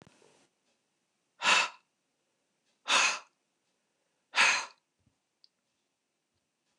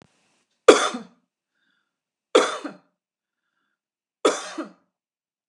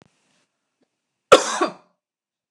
{"exhalation_length": "6.8 s", "exhalation_amplitude": 8987, "exhalation_signal_mean_std_ratio": 0.28, "three_cough_length": "5.5 s", "three_cough_amplitude": 29204, "three_cough_signal_mean_std_ratio": 0.22, "cough_length": "2.5 s", "cough_amplitude": 29204, "cough_signal_mean_std_ratio": 0.21, "survey_phase": "beta (2021-08-13 to 2022-03-07)", "age": "45-64", "gender": "Female", "wearing_mask": "No", "symptom_none": true, "smoker_status": "Never smoked", "respiratory_condition_asthma": false, "respiratory_condition_other": false, "recruitment_source": "REACT", "submission_delay": "2 days", "covid_test_result": "Negative", "covid_test_method": "RT-qPCR", "influenza_a_test_result": "Negative", "influenza_b_test_result": "Negative"}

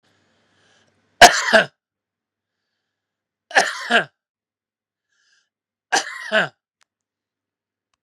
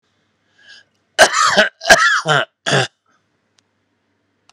{"three_cough_length": "8.0 s", "three_cough_amplitude": 32768, "three_cough_signal_mean_std_ratio": 0.23, "cough_length": "4.5 s", "cough_amplitude": 32768, "cough_signal_mean_std_ratio": 0.39, "survey_phase": "beta (2021-08-13 to 2022-03-07)", "age": "65+", "gender": "Male", "wearing_mask": "No", "symptom_none": true, "smoker_status": "Never smoked", "respiratory_condition_asthma": false, "respiratory_condition_other": false, "recruitment_source": "REACT", "submission_delay": "1 day", "covid_test_result": "Negative", "covid_test_method": "RT-qPCR", "influenza_a_test_result": "Unknown/Void", "influenza_b_test_result": "Unknown/Void"}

